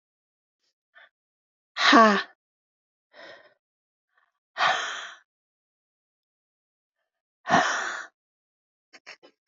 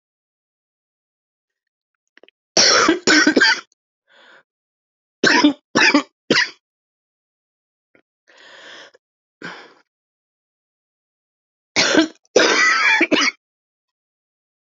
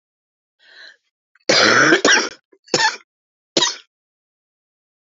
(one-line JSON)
{"exhalation_length": "9.5 s", "exhalation_amplitude": 25326, "exhalation_signal_mean_std_ratio": 0.26, "three_cough_length": "14.7 s", "three_cough_amplitude": 31040, "three_cough_signal_mean_std_ratio": 0.36, "cough_length": "5.1 s", "cough_amplitude": 32576, "cough_signal_mean_std_ratio": 0.37, "survey_phase": "alpha (2021-03-01 to 2021-08-12)", "age": "45-64", "gender": "Female", "wearing_mask": "No", "symptom_cough_any": true, "symptom_fatigue": true, "symptom_change_to_sense_of_smell_or_taste": true, "smoker_status": "Ex-smoker", "respiratory_condition_asthma": false, "respiratory_condition_other": false, "recruitment_source": "Test and Trace", "submission_delay": "2 days", "covid_test_result": "Positive", "covid_test_method": "RT-qPCR", "covid_ct_value": 27.1, "covid_ct_gene": "ORF1ab gene", "covid_ct_mean": 28.5, "covid_viral_load": "470 copies/ml", "covid_viral_load_category": "Minimal viral load (< 10K copies/ml)"}